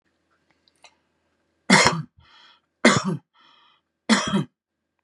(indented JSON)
{
  "three_cough_length": "5.0 s",
  "three_cough_amplitude": 32767,
  "three_cough_signal_mean_std_ratio": 0.31,
  "survey_phase": "beta (2021-08-13 to 2022-03-07)",
  "age": "45-64",
  "gender": "Male",
  "wearing_mask": "No",
  "symptom_none": true,
  "smoker_status": "Current smoker (11 or more cigarettes per day)",
  "respiratory_condition_asthma": false,
  "respiratory_condition_other": false,
  "recruitment_source": "REACT",
  "submission_delay": "2 days",
  "covid_test_result": "Negative",
  "covid_test_method": "RT-qPCR",
  "influenza_a_test_result": "Negative",
  "influenza_b_test_result": "Negative"
}